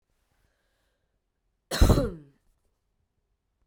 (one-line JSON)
{"cough_length": "3.7 s", "cough_amplitude": 18080, "cough_signal_mean_std_ratio": 0.22, "survey_phase": "beta (2021-08-13 to 2022-03-07)", "age": "18-44", "gender": "Female", "wearing_mask": "No", "symptom_cough_any": true, "symptom_runny_or_blocked_nose": true, "symptom_diarrhoea": true, "symptom_fatigue": true, "symptom_fever_high_temperature": true, "symptom_onset": "2 days", "smoker_status": "Never smoked", "respiratory_condition_asthma": false, "respiratory_condition_other": false, "recruitment_source": "Test and Trace", "submission_delay": "1 day", "covid_test_result": "Positive", "covid_test_method": "RT-qPCR", "covid_ct_value": 23.6, "covid_ct_gene": "ORF1ab gene", "covid_ct_mean": 24.4, "covid_viral_load": "10000 copies/ml", "covid_viral_load_category": "Low viral load (10K-1M copies/ml)"}